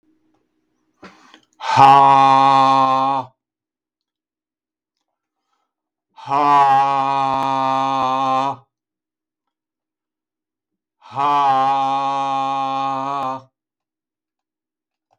{"exhalation_length": "15.2 s", "exhalation_amplitude": 32768, "exhalation_signal_mean_std_ratio": 0.51, "survey_phase": "beta (2021-08-13 to 2022-03-07)", "age": "65+", "gender": "Male", "wearing_mask": "No", "symptom_none": true, "smoker_status": "Never smoked", "respiratory_condition_asthma": false, "respiratory_condition_other": false, "recruitment_source": "Test and Trace", "submission_delay": "0 days", "covid_test_result": "Negative", "covid_test_method": "LFT"}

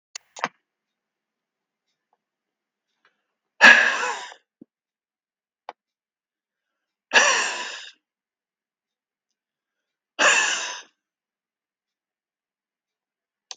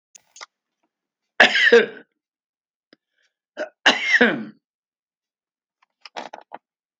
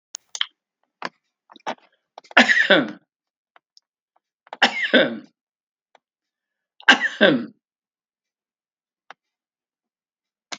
{"exhalation_length": "13.6 s", "exhalation_amplitude": 32768, "exhalation_signal_mean_std_ratio": 0.23, "cough_length": "7.0 s", "cough_amplitude": 32766, "cough_signal_mean_std_ratio": 0.28, "three_cough_length": "10.6 s", "three_cough_amplitude": 32709, "three_cough_signal_mean_std_ratio": 0.27, "survey_phase": "beta (2021-08-13 to 2022-03-07)", "age": "65+", "gender": "Male", "wearing_mask": "No", "symptom_runny_or_blocked_nose": true, "symptom_abdominal_pain": true, "symptom_fatigue": true, "smoker_status": "Ex-smoker", "respiratory_condition_asthma": false, "respiratory_condition_other": false, "recruitment_source": "REACT", "submission_delay": "1 day", "covid_test_result": "Negative", "covid_test_method": "RT-qPCR", "influenza_a_test_result": "Negative", "influenza_b_test_result": "Negative"}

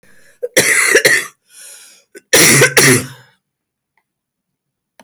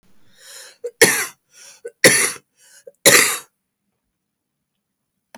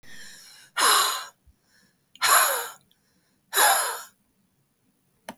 {"cough_length": "5.0 s", "cough_amplitude": 32768, "cough_signal_mean_std_ratio": 0.45, "three_cough_length": "5.4 s", "three_cough_amplitude": 32768, "three_cough_signal_mean_std_ratio": 0.3, "exhalation_length": "5.4 s", "exhalation_amplitude": 19285, "exhalation_signal_mean_std_ratio": 0.41, "survey_phase": "beta (2021-08-13 to 2022-03-07)", "age": "45-64", "gender": "Female", "wearing_mask": "No", "symptom_new_continuous_cough": true, "symptom_fatigue": true, "symptom_headache": true, "symptom_other": true, "symptom_onset": "4 days", "smoker_status": "Never smoked", "respiratory_condition_asthma": false, "respiratory_condition_other": false, "recruitment_source": "Test and Trace", "submission_delay": "1 day", "covid_test_result": "Negative", "covid_test_method": "ePCR"}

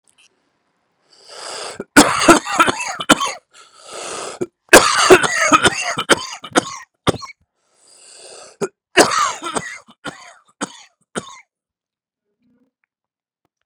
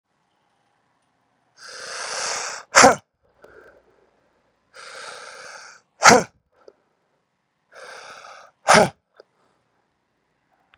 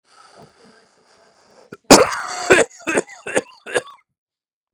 {"three_cough_length": "13.7 s", "three_cough_amplitude": 32768, "three_cough_signal_mean_std_ratio": 0.34, "exhalation_length": "10.8 s", "exhalation_amplitude": 32768, "exhalation_signal_mean_std_ratio": 0.22, "cough_length": "4.7 s", "cough_amplitude": 32768, "cough_signal_mean_std_ratio": 0.29, "survey_phase": "beta (2021-08-13 to 2022-03-07)", "age": "18-44", "gender": "Male", "wearing_mask": "No", "symptom_cough_any": true, "symptom_runny_or_blocked_nose": true, "symptom_shortness_of_breath": true, "symptom_abdominal_pain": true, "symptom_fatigue": true, "symptom_headache": true, "symptom_change_to_sense_of_smell_or_taste": true, "symptom_loss_of_taste": true, "symptom_onset": "4 days", "smoker_status": "Current smoker (e-cigarettes or vapes only)", "respiratory_condition_asthma": false, "respiratory_condition_other": false, "recruitment_source": "Test and Trace", "submission_delay": "1 day", "covid_test_result": "Positive", "covid_test_method": "RT-qPCR", "covid_ct_value": 25.7, "covid_ct_gene": "ORF1ab gene"}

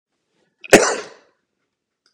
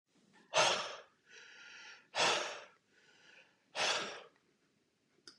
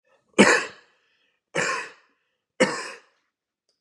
{"cough_length": "2.1 s", "cough_amplitude": 32768, "cough_signal_mean_std_ratio": 0.23, "exhalation_length": "5.4 s", "exhalation_amplitude": 5157, "exhalation_signal_mean_std_ratio": 0.39, "three_cough_length": "3.8 s", "three_cough_amplitude": 27263, "three_cough_signal_mean_std_ratio": 0.31, "survey_phase": "beta (2021-08-13 to 2022-03-07)", "age": "18-44", "gender": "Male", "wearing_mask": "No", "symptom_cough_any": true, "smoker_status": "Never smoked", "respiratory_condition_asthma": false, "respiratory_condition_other": false, "recruitment_source": "Test and Trace", "submission_delay": "2 days", "covid_test_result": "Positive", "covid_test_method": "RT-qPCR", "covid_ct_value": 11.7, "covid_ct_gene": "ORF1ab gene"}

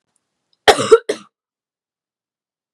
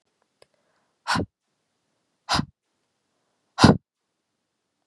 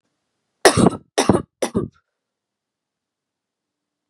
{"cough_length": "2.7 s", "cough_amplitude": 32768, "cough_signal_mean_std_ratio": 0.22, "exhalation_length": "4.9 s", "exhalation_amplitude": 32525, "exhalation_signal_mean_std_ratio": 0.2, "three_cough_length": "4.1 s", "three_cough_amplitude": 32768, "three_cough_signal_mean_std_ratio": 0.27, "survey_phase": "beta (2021-08-13 to 2022-03-07)", "age": "18-44", "gender": "Female", "wearing_mask": "No", "symptom_runny_or_blocked_nose": true, "symptom_sore_throat": true, "symptom_other": true, "smoker_status": "Never smoked", "respiratory_condition_asthma": false, "respiratory_condition_other": false, "recruitment_source": "Test and Trace", "submission_delay": "2 days", "covid_test_result": "Positive", "covid_test_method": "RT-qPCR", "covid_ct_value": 22.2, "covid_ct_gene": "ORF1ab gene", "covid_ct_mean": 22.4, "covid_viral_load": "46000 copies/ml", "covid_viral_load_category": "Low viral load (10K-1M copies/ml)"}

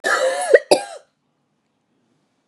{"cough_length": "2.5 s", "cough_amplitude": 32768, "cough_signal_mean_std_ratio": 0.36, "survey_phase": "beta (2021-08-13 to 2022-03-07)", "age": "45-64", "gender": "Female", "wearing_mask": "No", "symptom_cough_any": true, "symptom_new_continuous_cough": true, "symptom_runny_or_blocked_nose": true, "symptom_shortness_of_breath": true, "symptom_sore_throat": true, "symptom_fatigue": true, "symptom_fever_high_temperature": true, "symptom_headache": true, "symptom_change_to_sense_of_smell_or_taste": true, "symptom_onset": "4 days", "smoker_status": "Ex-smoker", "respiratory_condition_asthma": false, "respiratory_condition_other": false, "recruitment_source": "Test and Trace", "submission_delay": "1 day", "covid_test_result": "Positive", "covid_test_method": "RT-qPCR", "covid_ct_value": 12.1, "covid_ct_gene": "ORF1ab gene"}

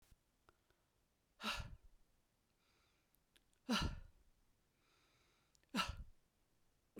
{"exhalation_length": "7.0 s", "exhalation_amplitude": 1871, "exhalation_signal_mean_std_ratio": 0.3, "survey_phase": "beta (2021-08-13 to 2022-03-07)", "age": "45-64", "gender": "Male", "wearing_mask": "No", "symptom_cough_any": true, "symptom_runny_or_blocked_nose": true, "symptom_fatigue": true, "symptom_headache": true, "symptom_change_to_sense_of_smell_or_taste": true, "symptom_loss_of_taste": true, "smoker_status": "Never smoked", "respiratory_condition_asthma": false, "respiratory_condition_other": false, "recruitment_source": "Test and Trace", "submission_delay": "2 days", "covid_test_result": "Positive", "covid_test_method": "RT-qPCR", "covid_ct_value": 17.1, "covid_ct_gene": "ORF1ab gene", "covid_ct_mean": 18.2, "covid_viral_load": "1100000 copies/ml", "covid_viral_load_category": "High viral load (>1M copies/ml)"}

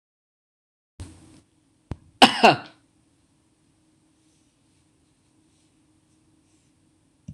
{"cough_length": "7.3 s", "cough_amplitude": 26028, "cough_signal_mean_std_ratio": 0.15, "survey_phase": "beta (2021-08-13 to 2022-03-07)", "age": "45-64", "gender": "Female", "wearing_mask": "No", "symptom_headache": true, "symptom_onset": "5 days", "smoker_status": "Current smoker (1 to 10 cigarettes per day)", "respiratory_condition_asthma": false, "respiratory_condition_other": false, "recruitment_source": "REACT", "submission_delay": "11 days", "covid_test_result": "Negative", "covid_test_method": "RT-qPCR"}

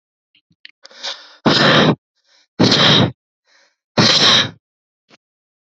{"exhalation_length": "5.7 s", "exhalation_amplitude": 31238, "exhalation_signal_mean_std_ratio": 0.45, "survey_phase": "beta (2021-08-13 to 2022-03-07)", "age": "18-44", "gender": "Female", "wearing_mask": "No", "symptom_runny_or_blocked_nose": true, "symptom_headache": true, "symptom_change_to_sense_of_smell_or_taste": true, "symptom_loss_of_taste": true, "symptom_onset": "5 days", "smoker_status": "Current smoker (1 to 10 cigarettes per day)", "respiratory_condition_asthma": false, "respiratory_condition_other": false, "recruitment_source": "Test and Trace", "submission_delay": "2 days", "covid_test_result": "Positive", "covid_test_method": "RT-qPCR"}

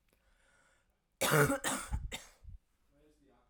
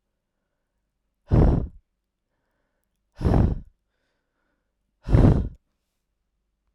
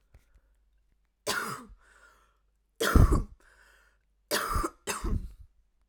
{"cough_length": "3.5 s", "cough_amplitude": 6419, "cough_signal_mean_std_ratio": 0.37, "exhalation_length": "6.7 s", "exhalation_amplitude": 21166, "exhalation_signal_mean_std_ratio": 0.31, "three_cough_length": "5.9 s", "three_cough_amplitude": 15065, "three_cough_signal_mean_std_ratio": 0.34, "survey_phase": "alpha (2021-03-01 to 2021-08-12)", "age": "18-44", "gender": "Female", "wearing_mask": "No", "symptom_cough_any": true, "symptom_fatigue": true, "symptom_change_to_sense_of_smell_or_taste": true, "symptom_loss_of_taste": true, "symptom_onset": "6 days", "smoker_status": "Ex-smoker", "respiratory_condition_asthma": false, "respiratory_condition_other": false, "recruitment_source": "Test and Trace", "submission_delay": "2 days", "covid_test_result": "Positive", "covid_test_method": "RT-qPCR"}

